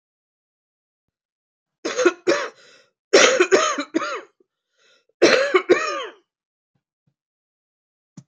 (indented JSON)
{
  "cough_length": "8.3 s",
  "cough_amplitude": 27608,
  "cough_signal_mean_std_ratio": 0.36,
  "survey_phase": "beta (2021-08-13 to 2022-03-07)",
  "age": "65+",
  "gender": "Female",
  "wearing_mask": "No",
  "symptom_cough_any": true,
  "symptom_runny_or_blocked_nose": true,
  "symptom_shortness_of_breath": true,
  "symptom_sore_throat": true,
  "symptom_fatigue": true,
  "symptom_fever_high_temperature": true,
  "symptom_headache": true,
  "symptom_change_to_sense_of_smell_or_taste": true,
  "symptom_loss_of_taste": true,
  "symptom_onset": "7 days",
  "smoker_status": "Current smoker (e-cigarettes or vapes only)",
  "respiratory_condition_asthma": false,
  "respiratory_condition_other": false,
  "recruitment_source": "Test and Trace",
  "submission_delay": "2 days",
  "covid_test_result": "Positive",
  "covid_test_method": "RT-qPCR",
  "covid_ct_value": 12.1,
  "covid_ct_gene": "N gene",
  "covid_ct_mean": 12.5,
  "covid_viral_load": "78000000 copies/ml",
  "covid_viral_load_category": "High viral load (>1M copies/ml)"
}